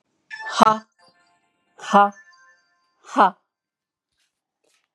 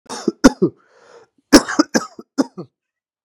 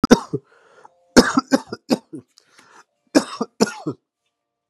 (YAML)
exhalation_length: 4.9 s
exhalation_amplitude: 32768
exhalation_signal_mean_std_ratio: 0.26
cough_length: 3.2 s
cough_amplitude: 32768
cough_signal_mean_std_ratio: 0.28
three_cough_length: 4.7 s
three_cough_amplitude: 32768
three_cough_signal_mean_std_ratio: 0.27
survey_phase: beta (2021-08-13 to 2022-03-07)
age: 18-44
gender: Female
wearing_mask: 'No'
symptom_runny_or_blocked_nose: true
symptom_sore_throat: true
symptom_onset: 12 days
smoker_status: Never smoked
respiratory_condition_asthma: false
respiratory_condition_other: false
recruitment_source: REACT
submission_delay: 2 days
covid_test_result: Negative
covid_test_method: RT-qPCR